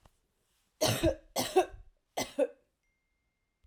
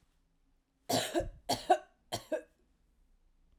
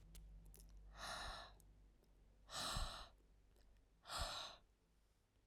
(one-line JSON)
{"three_cough_length": "3.7 s", "three_cough_amplitude": 6481, "three_cough_signal_mean_std_ratio": 0.35, "cough_length": "3.6 s", "cough_amplitude": 6406, "cough_signal_mean_std_ratio": 0.34, "exhalation_length": "5.5 s", "exhalation_amplitude": 798, "exhalation_signal_mean_std_ratio": 0.57, "survey_phase": "alpha (2021-03-01 to 2021-08-12)", "age": "18-44", "gender": "Female", "wearing_mask": "No", "symptom_none": true, "smoker_status": "Never smoked", "respiratory_condition_asthma": false, "respiratory_condition_other": false, "recruitment_source": "REACT", "submission_delay": "1 day", "covid_test_result": "Negative", "covid_test_method": "RT-qPCR"}